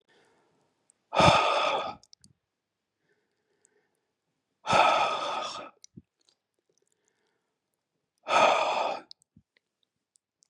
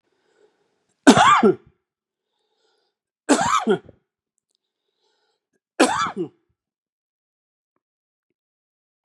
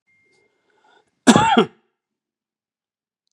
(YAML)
exhalation_length: 10.5 s
exhalation_amplitude: 16113
exhalation_signal_mean_std_ratio: 0.36
three_cough_length: 9.0 s
three_cough_amplitude: 32768
three_cough_signal_mean_std_ratio: 0.27
cough_length: 3.3 s
cough_amplitude: 32768
cough_signal_mean_std_ratio: 0.25
survey_phase: beta (2021-08-13 to 2022-03-07)
age: 45-64
gender: Male
wearing_mask: 'No'
symptom_runny_or_blocked_nose: true
smoker_status: Ex-smoker
respiratory_condition_asthma: false
respiratory_condition_other: false
recruitment_source: REACT
submission_delay: 2 days
covid_test_result: Negative
covid_test_method: RT-qPCR
influenza_a_test_result: Negative
influenza_b_test_result: Negative